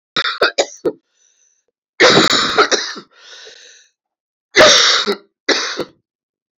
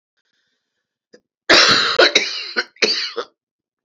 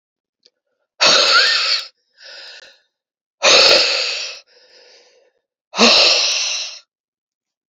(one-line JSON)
{"three_cough_length": "6.6 s", "three_cough_amplitude": 32302, "three_cough_signal_mean_std_ratio": 0.45, "cough_length": "3.8 s", "cough_amplitude": 31447, "cough_signal_mean_std_ratio": 0.43, "exhalation_length": "7.7 s", "exhalation_amplitude": 32768, "exhalation_signal_mean_std_ratio": 0.47, "survey_phase": "beta (2021-08-13 to 2022-03-07)", "age": "45-64", "gender": "Male", "wearing_mask": "No", "symptom_cough_any": true, "symptom_new_continuous_cough": true, "symptom_runny_or_blocked_nose": true, "symptom_shortness_of_breath": true, "symptom_sore_throat": true, "symptom_fatigue": true, "symptom_fever_high_temperature": true, "symptom_headache": true, "symptom_change_to_sense_of_smell_or_taste": true, "symptom_other": true, "symptom_onset": "3 days", "smoker_status": "Never smoked", "respiratory_condition_asthma": false, "respiratory_condition_other": false, "recruitment_source": "Test and Trace", "submission_delay": "2 days", "covid_test_result": "Positive", "covid_test_method": "RT-qPCR", "covid_ct_value": 24.5, "covid_ct_gene": "N gene", "covid_ct_mean": 24.8, "covid_viral_load": "7500 copies/ml", "covid_viral_load_category": "Minimal viral load (< 10K copies/ml)"}